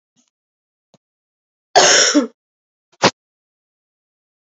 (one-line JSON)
{"cough_length": "4.5 s", "cough_amplitude": 32768, "cough_signal_mean_std_ratio": 0.28, "survey_phase": "beta (2021-08-13 to 2022-03-07)", "age": "18-44", "gender": "Female", "wearing_mask": "No", "symptom_cough_any": true, "symptom_runny_or_blocked_nose": true, "symptom_abdominal_pain": true, "symptom_fatigue": true, "smoker_status": "Current smoker (11 or more cigarettes per day)", "respiratory_condition_asthma": false, "respiratory_condition_other": false, "recruitment_source": "Test and Trace", "submission_delay": "1 day", "covid_test_result": "Positive", "covid_test_method": "ePCR"}